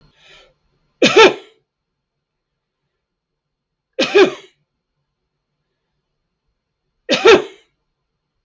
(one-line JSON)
{"three_cough_length": "8.4 s", "three_cough_amplitude": 32768, "three_cough_signal_mean_std_ratio": 0.25, "survey_phase": "beta (2021-08-13 to 2022-03-07)", "age": "65+", "gender": "Male", "wearing_mask": "No", "symptom_none": true, "smoker_status": "Never smoked", "respiratory_condition_asthma": true, "respiratory_condition_other": false, "recruitment_source": "REACT", "submission_delay": "2 days", "covid_test_result": "Negative", "covid_test_method": "RT-qPCR", "influenza_a_test_result": "Unknown/Void", "influenza_b_test_result": "Unknown/Void"}